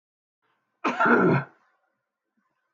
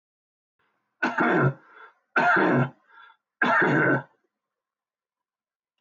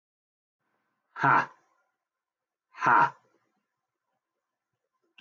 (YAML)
cough_length: 2.7 s
cough_amplitude: 16171
cough_signal_mean_std_ratio: 0.37
three_cough_length: 5.8 s
three_cough_amplitude: 11933
three_cough_signal_mean_std_ratio: 0.46
exhalation_length: 5.2 s
exhalation_amplitude: 11736
exhalation_signal_mean_std_ratio: 0.25
survey_phase: alpha (2021-03-01 to 2021-08-12)
age: 45-64
gender: Male
wearing_mask: 'No'
symptom_shortness_of_breath: true
symptom_fatigue: true
symptom_onset: 12 days
smoker_status: Never smoked
respiratory_condition_asthma: false
respiratory_condition_other: false
recruitment_source: REACT
submission_delay: 1 day
covid_test_result: Negative
covid_test_method: RT-qPCR